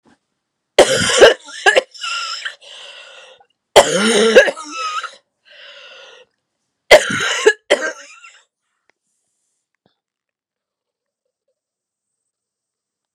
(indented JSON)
{
  "three_cough_length": "13.1 s",
  "three_cough_amplitude": 32768,
  "three_cough_signal_mean_std_ratio": 0.32,
  "survey_phase": "beta (2021-08-13 to 2022-03-07)",
  "age": "18-44",
  "gender": "Female",
  "wearing_mask": "No",
  "symptom_new_continuous_cough": true,
  "symptom_runny_or_blocked_nose": true,
  "symptom_sore_throat": true,
  "symptom_fatigue": true,
  "symptom_fever_high_temperature": true,
  "symptom_headache": true,
  "symptom_other": true,
  "symptom_onset": "3 days",
  "smoker_status": "Never smoked",
  "respiratory_condition_asthma": false,
  "respiratory_condition_other": false,
  "recruitment_source": "Test and Trace",
  "submission_delay": "1 day",
  "covid_test_result": "Positive",
  "covid_test_method": "RT-qPCR",
  "covid_ct_value": 22.1,
  "covid_ct_gene": "ORF1ab gene"
}